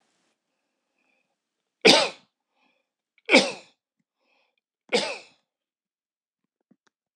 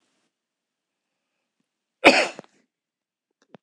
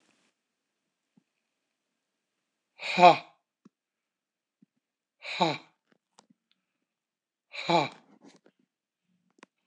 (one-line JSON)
{"three_cough_length": "7.2 s", "three_cough_amplitude": 26028, "three_cough_signal_mean_std_ratio": 0.21, "cough_length": "3.6 s", "cough_amplitude": 26028, "cough_signal_mean_std_ratio": 0.18, "exhalation_length": "9.7 s", "exhalation_amplitude": 20662, "exhalation_signal_mean_std_ratio": 0.18, "survey_phase": "beta (2021-08-13 to 2022-03-07)", "age": "65+", "gender": "Male", "wearing_mask": "No", "symptom_none": true, "smoker_status": "Ex-smoker", "respiratory_condition_asthma": false, "respiratory_condition_other": false, "recruitment_source": "REACT", "submission_delay": "1 day", "covid_test_result": "Negative", "covid_test_method": "RT-qPCR", "influenza_a_test_result": "Negative", "influenza_b_test_result": "Negative"}